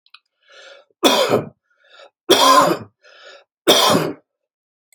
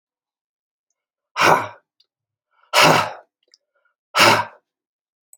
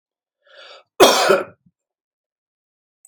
three_cough_length: 4.9 s
three_cough_amplitude: 30321
three_cough_signal_mean_std_ratio: 0.43
exhalation_length: 5.4 s
exhalation_amplitude: 29846
exhalation_signal_mean_std_ratio: 0.32
cough_length: 3.1 s
cough_amplitude: 30050
cough_signal_mean_std_ratio: 0.29
survey_phase: alpha (2021-03-01 to 2021-08-12)
age: 45-64
gender: Male
wearing_mask: 'No'
symptom_none: true
symptom_onset: 7 days
smoker_status: Never smoked
respiratory_condition_asthma: false
respiratory_condition_other: false
recruitment_source: REACT
submission_delay: 5 days
covid_test_result: Negative
covid_test_method: RT-qPCR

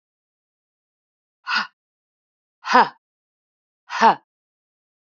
exhalation_length: 5.1 s
exhalation_amplitude: 27981
exhalation_signal_mean_std_ratio: 0.23
survey_phase: beta (2021-08-13 to 2022-03-07)
age: 45-64
gender: Female
wearing_mask: 'No'
symptom_sore_throat: true
symptom_onset: 12 days
smoker_status: Ex-smoker
respiratory_condition_asthma: false
respiratory_condition_other: false
recruitment_source: REACT
submission_delay: 0 days
covid_test_result: Negative
covid_test_method: RT-qPCR
influenza_a_test_result: Negative
influenza_b_test_result: Negative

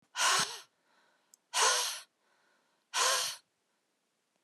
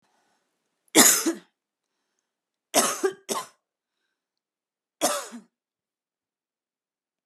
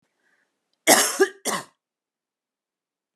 exhalation_length: 4.4 s
exhalation_amplitude: 5911
exhalation_signal_mean_std_ratio: 0.42
three_cough_length: 7.3 s
three_cough_amplitude: 32040
three_cough_signal_mean_std_ratio: 0.26
cough_length: 3.2 s
cough_amplitude: 31438
cough_signal_mean_std_ratio: 0.28
survey_phase: alpha (2021-03-01 to 2021-08-12)
age: 18-44
gender: Female
wearing_mask: 'No'
symptom_abdominal_pain: true
symptom_fatigue: true
symptom_fever_high_temperature: true
symptom_headache: true
symptom_onset: 4 days
smoker_status: Ex-smoker
respiratory_condition_asthma: false
respiratory_condition_other: false
recruitment_source: Test and Trace
submission_delay: 1 day
covid_test_result: Positive
covid_test_method: RT-qPCR
covid_ct_value: 25.1
covid_ct_gene: ORF1ab gene
covid_ct_mean: 25.6
covid_viral_load: 3900 copies/ml
covid_viral_load_category: Minimal viral load (< 10K copies/ml)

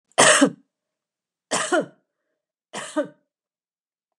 three_cough_length: 4.2 s
three_cough_amplitude: 29061
three_cough_signal_mean_std_ratio: 0.32
survey_phase: beta (2021-08-13 to 2022-03-07)
age: 65+
gender: Female
wearing_mask: 'No'
symptom_none: true
smoker_status: Never smoked
respiratory_condition_asthma: false
respiratory_condition_other: false
recruitment_source: REACT
submission_delay: 2 days
covid_test_result: Negative
covid_test_method: RT-qPCR
influenza_a_test_result: Negative
influenza_b_test_result: Negative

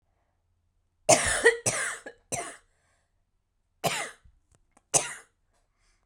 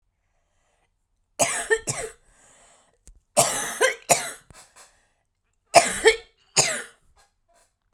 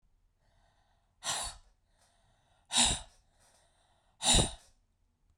cough_length: 6.1 s
cough_amplitude: 27545
cough_signal_mean_std_ratio: 0.31
three_cough_length: 7.9 s
three_cough_amplitude: 32768
three_cough_signal_mean_std_ratio: 0.32
exhalation_length: 5.4 s
exhalation_amplitude: 7557
exhalation_signal_mean_std_ratio: 0.29
survey_phase: beta (2021-08-13 to 2022-03-07)
age: 45-64
gender: Female
wearing_mask: 'No'
symptom_cough_any: true
symptom_new_continuous_cough: true
symptom_runny_or_blocked_nose: true
symptom_shortness_of_breath: true
symptom_fatigue: true
symptom_fever_high_temperature: true
symptom_other: true
smoker_status: Never smoked
respiratory_condition_asthma: true
respiratory_condition_other: false
recruitment_source: Test and Trace
submission_delay: 1 day
covid_test_result: Positive
covid_test_method: LFT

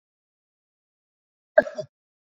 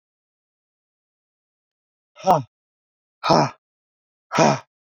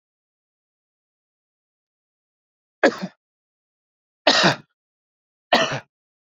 cough_length: 2.3 s
cough_amplitude: 26284
cough_signal_mean_std_ratio: 0.13
exhalation_length: 4.9 s
exhalation_amplitude: 26439
exhalation_signal_mean_std_ratio: 0.27
three_cough_length: 6.3 s
three_cough_amplitude: 28219
three_cough_signal_mean_std_ratio: 0.24
survey_phase: beta (2021-08-13 to 2022-03-07)
age: 45-64
gender: Male
wearing_mask: 'No'
symptom_cough_any: true
smoker_status: Never smoked
respiratory_condition_asthma: false
respiratory_condition_other: false
recruitment_source: REACT
submission_delay: 3 days
covid_test_result: Negative
covid_test_method: RT-qPCR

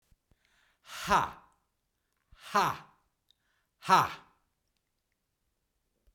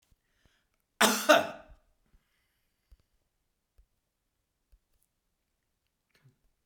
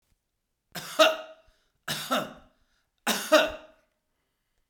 exhalation_length: 6.1 s
exhalation_amplitude: 10087
exhalation_signal_mean_std_ratio: 0.26
cough_length: 6.7 s
cough_amplitude: 17664
cough_signal_mean_std_ratio: 0.18
three_cough_length: 4.7 s
three_cough_amplitude: 19295
three_cough_signal_mean_std_ratio: 0.32
survey_phase: beta (2021-08-13 to 2022-03-07)
age: 65+
gender: Male
wearing_mask: 'No'
symptom_none: true
smoker_status: Ex-smoker
respiratory_condition_asthma: true
respiratory_condition_other: false
recruitment_source: REACT
submission_delay: 2 days
covid_test_result: Negative
covid_test_method: RT-qPCR
influenza_a_test_result: Negative
influenza_b_test_result: Negative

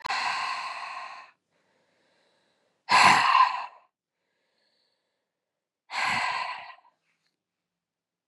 exhalation_length: 8.3 s
exhalation_amplitude: 18864
exhalation_signal_mean_std_ratio: 0.36
survey_phase: beta (2021-08-13 to 2022-03-07)
age: 45-64
gender: Female
wearing_mask: 'No'
symptom_new_continuous_cough: true
symptom_runny_or_blocked_nose: true
symptom_shortness_of_breath: true
symptom_fatigue: true
symptom_fever_high_temperature: true
symptom_headache: true
symptom_onset: 3 days
smoker_status: Never smoked
respiratory_condition_asthma: false
respiratory_condition_other: false
recruitment_source: Test and Trace
submission_delay: 1 day
covid_test_result: Positive
covid_test_method: ePCR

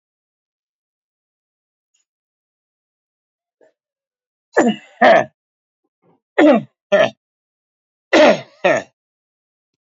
three_cough_length: 9.8 s
three_cough_amplitude: 28237
three_cough_signal_mean_std_ratio: 0.28
survey_phase: beta (2021-08-13 to 2022-03-07)
age: 65+
gender: Male
wearing_mask: 'No'
symptom_none: true
smoker_status: Ex-smoker
respiratory_condition_asthma: false
respiratory_condition_other: false
recruitment_source: REACT
submission_delay: 1 day
covid_test_result: Negative
covid_test_method: RT-qPCR
influenza_a_test_result: Negative
influenza_b_test_result: Negative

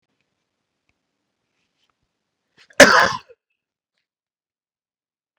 cough_length: 5.4 s
cough_amplitude: 32768
cough_signal_mean_std_ratio: 0.17
survey_phase: beta (2021-08-13 to 2022-03-07)
age: 18-44
gender: Male
wearing_mask: 'No'
symptom_none: true
smoker_status: Never smoked
recruitment_source: REACT
submission_delay: 2 days
covid_test_result: Negative
covid_test_method: RT-qPCR
influenza_a_test_result: Unknown/Void
influenza_b_test_result: Unknown/Void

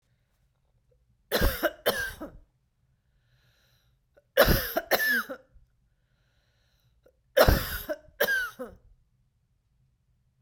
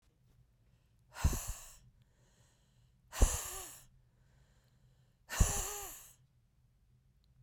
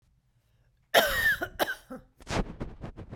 three_cough_length: 10.4 s
three_cough_amplitude: 18349
three_cough_signal_mean_std_ratio: 0.34
exhalation_length: 7.4 s
exhalation_amplitude: 7753
exhalation_signal_mean_std_ratio: 0.29
cough_length: 3.2 s
cough_amplitude: 15207
cough_signal_mean_std_ratio: 0.45
survey_phase: beta (2021-08-13 to 2022-03-07)
age: 45-64
gender: Female
wearing_mask: 'No'
symptom_runny_or_blocked_nose: true
symptom_fatigue: true
symptom_headache: true
symptom_onset: 2 days
smoker_status: Never smoked
respiratory_condition_asthma: false
respiratory_condition_other: false
recruitment_source: Test and Trace
submission_delay: 1 day
covid_test_result: Positive
covid_test_method: RT-qPCR
covid_ct_value: 26.4
covid_ct_gene: ORF1ab gene
covid_ct_mean: 26.7
covid_viral_load: 1700 copies/ml
covid_viral_load_category: Minimal viral load (< 10K copies/ml)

